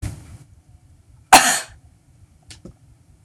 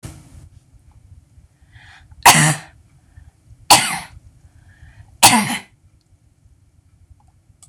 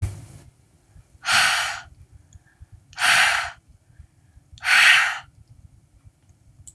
{
  "cough_length": "3.2 s",
  "cough_amplitude": 26028,
  "cough_signal_mean_std_ratio": 0.25,
  "three_cough_length": "7.7 s",
  "three_cough_amplitude": 26028,
  "three_cough_signal_mean_std_ratio": 0.27,
  "exhalation_length": "6.7 s",
  "exhalation_amplitude": 25118,
  "exhalation_signal_mean_std_ratio": 0.41,
  "survey_phase": "beta (2021-08-13 to 2022-03-07)",
  "age": "45-64",
  "gender": "Female",
  "wearing_mask": "No",
  "symptom_none": true,
  "smoker_status": "Ex-smoker",
  "respiratory_condition_asthma": false,
  "respiratory_condition_other": false,
  "recruitment_source": "REACT",
  "submission_delay": "1 day",
  "covid_test_result": "Negative",
  "covid_test_method": "RT-qPCR"
}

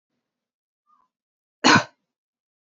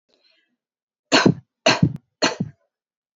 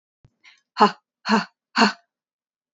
{
  "cough_length": "2.6 s",
  "cough_amplitude": 30611,
  "cough_signal_mean_std_ratio": 0.2,
  "three_cough_length": "3.2 s",
  "three_cough_amplitude": 28669,
  "three_cough_signal_mean_std_ratio": 0.32,
  "exhalation_length": "2.7 s",
  "exhalation_amplitude": 26318,
  "exhalation_signal_mean_std_ratio": 0.3,
  "survey_phase": "alpha (2021-03-01 to 2021-08-12)",
  "age": "18-44",
  "gender": "Female",
  "wearing_mask": "No",
  "symptom_none": true,
  "smoker_status": "Ex-smoker",
  "respiratory_condition_asthma": true,
  "respiratory_condition_other": false,
  "recruitment_source": "REACT",
  "submission_delay": "2 days",
  "covid_test_result": "Negative",
  "covid_test_method": "RT-qPCR"
}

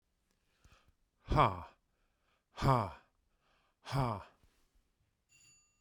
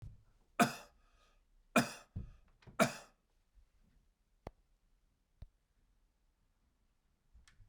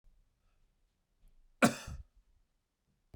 {
  "exhalation_length": "5.8 s",
  "exhalation_amplitude": 6642,
  "exhalation_signal_mean_std_ratio": 0.3,
  "three_cough_length": "7.7 s",
  "three_cough_amplitude": 5863,
  "three_cough_signal_mean_std_ratio": 0.21,
  "cough_length": "3.2 s",
  "cough_amplitude": 8576,
  "cough_signal_mean_std_ratio": 0.18,
  "survey_phase": "beta (2021-08-13 to 2022-03-07)",
  "age": "65+",
  "gender": "Male",
  "wearing_mask": "No",
  "symptom_none": true,
  "smoker_status": "Never smoked",
  "respiratory_condition_asthma": false,
  "respiratory_condition_other": false,
  "recruitment_source": "REACT",
  "submission_delay": "1 day",
  "covid_test_result": "Negative",
  "covid_test_method": "RT-qPCR",
  "influenza_a_test_result": "Negative",
  "influenza_b_test_result": "Negative"
}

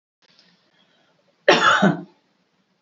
{
  "cough_length": "2.8 s",
  "cough_amplitude": 27571,
  "cough_signal_mean_std_ratio": 0.33,
  "survey_phase": "beta (2021-08-13 to 2022-03-07)",
  "age": "65+",
  "gender": "Female",
  "wearing_mask": "No",
  "symptom_none": true,
  "smoker_status": "Ex-smoker",
  "respiratory_condition_asthma": false,
  "respiratory_condition_other": false,
  "recruitment_source": "REACT",
  "submission_delay": "0 days",
  "covid_test_result": "Negative",
  "covid_test_method": "RT-qPCR",
  "influenza_a_test_result": "Negative",
  "influenza_b_test_result": "Negative"
}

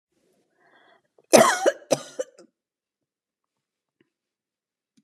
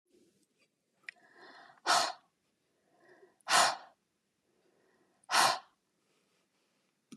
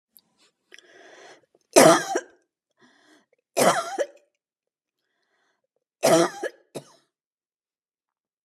{
  "cough_length": "5.0 s",
  "cough_amplitude": 32281,
  "cough_signal_mean_std_ratio": 0.21,
  "exhalation_length": "7.2 s",
  "exhalation_amplitude": 7237,
  "exhalation_signal_mean_std_ratio": 0.27,
  "three_cough_length": "8.4 s",
  "three_cough_amplitude": 31624,
  "three_cough_signal_mean_std_ratio": 0.26,
  "survey_phase": "beta (2021-08-13 to 2022-03-07)",
  "age": "45-64",
  "gender": "Female",
  "wearing_mask": "No",
  "symptom_none": true,
  "smoker_status": "Never smoked",
  "respiratory_condition_asthma": false,
  "respiratory_condition_other": false,
  "recruitment_source": "REACT",
  "submission_delay": "5 days",
  "covid_test_result": "Negative",
  "covid_test_method": "RT-qPCR"
}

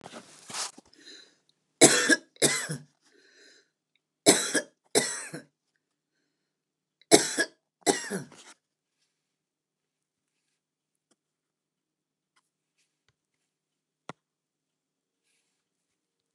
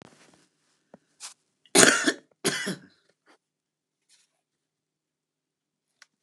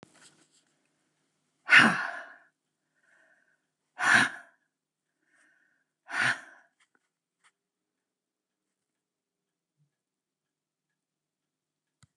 {
  "three_cough_length": "16.3 s",
  "three_cough_amplitude": 29130,
  "three_cough_signal_mean_std_ratio": 0.23,
  "cough_length": "6.2 s",
  "cough_amplitude": 29204,
  "cough_signal_mean_std_ratio": 0.22,
  "exhalation_length": "12.2 s",
  "exhalation_amplitude": 17918,
  "exhalation_signal_mean_std_ratio": 0.2,
  "survey_phase": "beta (2021-08-13 to 2022-03-07)",
  "age": "65+",
  "gender": "Female",
  "wearing_mask": "No",
  "symptom_none": true,
  "smoker_status": "Current smoker (11 or more cigarettes per day)",
  "respiratory_condition_asthma": false,
  "respiratory_condition_other": false,
  "recruitment_source": "REACT",
  "submission_delay": "1 day",
  "covid_test_result": "Negative",
  "covid_test_method": "RT-qPCR"
}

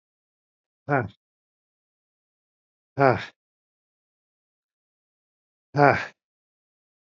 {
  "exhalation_length": "7.1 s",
  "exhalation_amplitude": 27656,
  "exhalation_signal_mean_std_ratio": 0.2,
  "survey_phase": "beta (2021-08-13 to 2022-03-07)",
  "age": "45-64",
  "gender": "Male",
  "wearing_mask": "No",
  "symptom_none": true,
  "smoker_status": "Never smoked",
  "respiratory_condition_asthma": false,
  "respiratory_condition_other": false,
  "recruitment_source": "REACT",
  "submission_delay": "2 days",
  "covid_test_result": "Negative",
  "covid_test_method": "RT-qPCR",
  "influenza_a_test_result": "Negative",
  "influenza_b_test_result": "Negative"
}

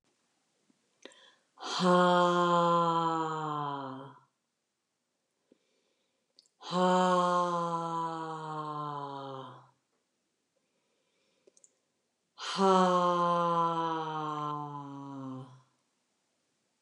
{
  "exhalation_length": "16.8 s",
  "exhalation_amplitude": 7051,
  "exhalation_signal_mean_std_ratio": 0.53,
  "survey_phase": "alpha (2021-03-01 to 2021-08-12)",
  "age": "45-64",
  "gender": "Female",
  "wearing_mask": "No",
  "symptom_none": true,
  "smoker_status": "Never smoked",
  "respiratory_condition_asthma": true,
  "respiratory_condition_other": false,
  "recruitment_source": "REACT",
  "submission_delay": "2 days",
  "covid_test_result": "Negative",
  "covid_test_method": "RT-qPCR"
}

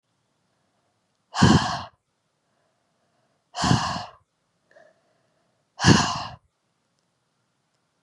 {
  "exhalation_length": "8.0 s",
  "exhalation_amplitude": 29558,
  "exhalation_signal_mean_std_ratio": 0.28,
  "survey_phase": "beta (2021-08-13 to 2022-03-07)",
  "age": "18-44",
  "gender": "Female",
  "wearing_mask": "No",
  "symptom_cough_any": true,
  "symptom_runny_or_blocked_nose": true,
  "symptom_sore_throat": true,
  "symptom_headache": true,
  "symptom_other": true,
  "symptom_onset": "4 days",
  "smoker_status": "Never smoked",
  "respiratory_condition_asthma": false,
  "respiratory_condition_other": false,
  "recruitment_source": "Test and Trace",
  "submission_delay": "2 days",
  "covid_test_result": "Positive",
  "covid_test_method": "ePCR"
}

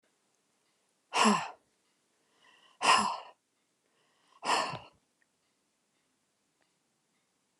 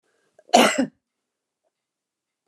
{
  "exhalation_length": "7.6 s",
  "exhalation_amplitude": 9529,
  "exhalation_signal_mean_std_ratio": 0.28,
  "cough_length": "2.5 s",
  "cough_amplitude": 29136,
  "cough_signal_mean_std_ratio": 0.26,
  "survey_phase": "alpha (2021-03-01 to 2021-08-12)",
  "age": "65+",
  "gender": "Female",
  "wearing_mask": "No",
  "symptom_none": true,
  "smoker_status": "Ex-smoker",
  "respiratory_condition_asthma": false,
  "respiratory_condition_other": false,
  "recruitment_source": "REACT",
  "submission_delay": "1 day",
  "covid_test_result": "Negative",
  "covid_test_method": "RT-qPCR"
}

